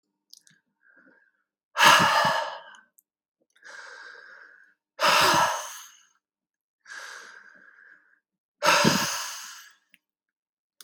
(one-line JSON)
{"exhalation_length": "10.8 s", "exhalation_amplitude": 24837, "exhalation_signal_mean_std_ratio": 0.36, "survey_phase": "beta (2021-08-13 to 2022-03-07)", "age": "45-64", "gender": "Male", "wearing_mask": "No", "symptom_cough_any": true, "symptom_sore_throat": true, "symptom_fatigue": true, "symptom_headache": true, "symptom_change_to_sense_of_smell_or_taste": true, "symptom_loss_of_taste": true, "symptom_onset": "12 days", "smoker_status": "Never smoked", "respiratory_condition_asthma": false, "respiratory_condition_other": false, "recruitment_source": "REACT", "submission_delay": "1 day", "covid_test_result": "Negative", "covid_test_method": "RT-qPCR", "influenza_a_test_result": "Unknown/Void", "influenza_b_test_result": "Unknown/Void"}